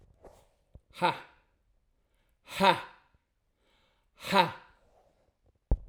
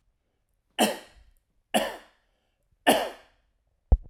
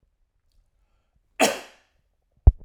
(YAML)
exhalation_length: 5.9 s
exhalation_amplitude: 15484
exhalation_signal_mean_std_ratio: 0.26
three_cough_length: 4.1 s
three_cough_amplitude: 17610
three_cough_signal_mean_std_ratio: 0.28
cough_length: 2.6 s
cough_amplitude: 32065
cough_signal_mean_std_ratio: 0.18
survey_phase: alpha (2021-03-01 to 2021-08-12)
age: 45-64
gender: Male
wearing_mask: 'No'
symptom_none: true
smoker_status: Never smoked
respiratory_condition_asthma: false
respiratory_condition_other: false
recruitment_source: REACT
submission_delay: 1 day
covid_test_result: Negative
covid_test_method: RT-qPCR